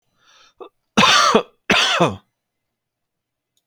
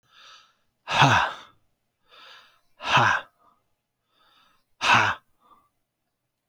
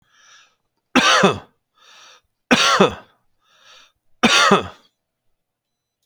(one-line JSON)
{"cough_length": "3.7 s", "cough_amplitude": 32768, "cough_signal_mean_std_ratio": 0.4, "exhalation_length": "6.5 s", "exhalation_amplitude": 22693, "exhalation_signal_mean_std_ratio": 0.33, "three_cough_length": "6.1 s", "three_cough_amplitude": 32191, "three_cough_signal_mean_std_ratio": 0.37, "survey_phase": "beta (2021-08-13 to 2022-03-07)", "age": "45-64", "gender": "Male", "wearing_mask": "No", "symptom_headache": true, "symptom_onset": "12 days", "smoker_status": "Ex-smoker", "respiratory_condition_asthma": false, "respiratory_condition_other": false, "recruitment_source": "REACT", "submission_delay": "4 days", "covid_test_result": "Negative", "covid_test_method": "RT-qPCR"}